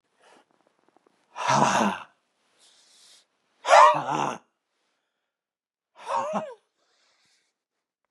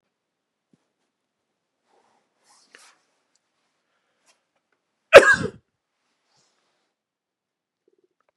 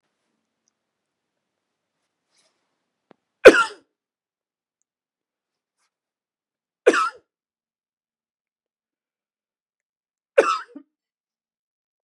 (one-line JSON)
{"exhalation_length": "8.1 s", "exhalation_amplitude": 25191, "exhalation_signal_mean_std_ratio": 0.3, "cough_length": "8.4 s", "cough_amplitude": 32768, "cough_signal_mean_std_ratio": 0.12, "three_cough_length": "12.0 s", "three_cough_amplitude": 32768, "three_cough_signal_mean_std_ratio": 0.14, "survey_phase": "beta (2021-08-13 to 2022-03-07)", "age": "45-64", "gender": "Male", "wearing_mask": "No", "symptom_none": true, "smoker_status": "Never smoked", "respiratory_condition_asthma": false, "respiratory_condition_other": false, "recruitment_source": "REACT", "submission_delay": "1 day", "covid_test_result": "Negative", "covid_test_method": "RT-qPCR", "influenza_a_test_result": "Negative", "influenza_b_test_result": "Negative"}